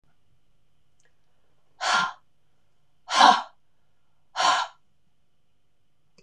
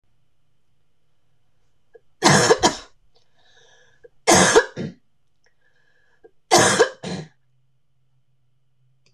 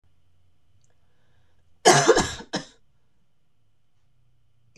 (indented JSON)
{
  "exhalation_length": "6.2 s",
  "exhalation_amplitude": 26028,
  "exhalation_signal_mean_std_ratio": 0.3,
  "three_cough_length": "9.1 s",
  "three_cough_amplitude": 25953,
  "three_cough_signal_mean_std_ratio": 0.31,
  "cough_length": "4.8 s",
  "cough_amplitude": 25355,
  "cough_signal_mean_std_ratio": 0.26,
  "survey_phase": "beta (2021-08-13 to 2022-03-07)",
  "age": "45-64",
  "gender": "Female",
  "wearing_mask": "No",
  "symptom_cough_any": true,
  "symptom_runny_or_blocked_nose": true,
  "symptom_sore_throat": true,
  "symptom_abdominal_pain": true,
  "symptom_fatigue": true,
  "symptom_fever_high_temperature": true,
  "symptom_headache": true,
  "symptom_other": true,
  "smoker_status": "Never smoked",
  "respiratory_condition_asthma": false,
  "respiratory_condition_other": false,
  "recruitment_source": "Test and Trace",
  "submission_delay": "2 days",
  "covid_test_result": "Positive",
  "covid_test_method": "RT-qPCR",
  "covid_ct_value": 22.6,
  "covid_ct_gene": "ORF1ab gene",
  "covid_ct_mean": 23.7,
  "covid_viral_load": "17000 copies/ml",
  "covid_viral_load_category": "Low viral load (10K-1M copies/ml)"
}